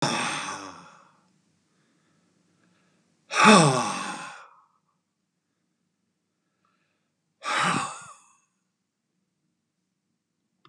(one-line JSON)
{"exhalation_length": "10.7 s", "exhalation_amplitude": 29152, "exhalation_signal_mean_std_ratio": 0.28, "survey_phase": "beta (2021-08-13 to 2022-03-07)", "age": "45-64", "gender": "Male", "wearing_mask": "No", "symptom_none": true, "smoker_status": "Never smoked", "respiratory_condition_asthma": false, "respiratory_condition_other": false, "recruitment_source": "REACT", "submission_delay": "0 days", "covid_test_result": "Negative", "covid_test_method": "RT-qPCR", "influenza_a_test_result": "Negative", "influenza_b_test_result": "Negative"}